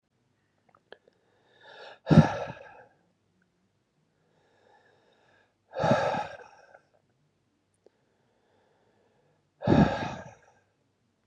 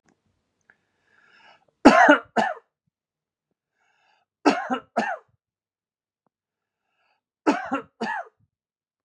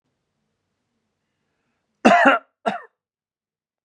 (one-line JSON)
{"exhalation_length": "11.3 s", "exhalation_amplitude": 19068, "exhalation_signal_mean_std_ratio": 0.24, "three_cough_length": "9.0 s", "three_cough_amplitude": 32767, "three_cough_signal_mean_std_ratio": 0.25, "cough_length": "3.8 s", "cough_amplitude": 32767, "cough_signal_mean_std_ratio": 0.26, "survey_phase": "beta (2021-08-13 to 2022-03-07)", "age": "18-44", "gender": "Male", "wearing_mask": "No", "symptom_none": true, "smoker_status": "Never smoked", "respiratory_condition_asthma": false, "respiratory_condition_other": false, "recruitment_source": "REACT", "submission_delay": "2 days", "covid_test_result": "Negative", "covid_test_method": "RT-qPCR"}